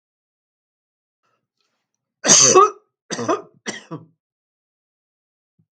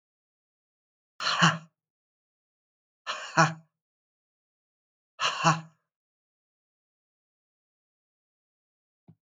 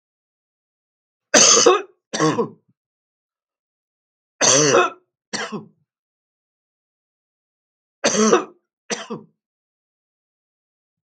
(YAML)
cough_length: 5.7 s
cough_amplitude: 32768
cough_signal_mean_std_ratio: 0.26
exhalation_length: 9.2 s
exhalation_amplitude: 19390
exhalation_signal_mean_std_ratio: 0.23
three_cough_length: 11.1 s
three_cough_amplitude: 32768
three_cough_signal_mean_std_ratio: 0.32
survey_phase: beta (2021-08-13 to 2022-03-07)
age: 45-64
gender: Male
wearing_mask: 'No'
symptom_runny_or_blocked_nose: true
smoker_status: Never smoked
respiratory_condition_asthma: false
respiratory_condition_other: false
recruitment_source: REACT
submission_delay: 4 days
covid_test_result: Negative
covid_test_method: RT-qPCR
influenza_a_test_result: Negative
influenza_b_test_result: Negative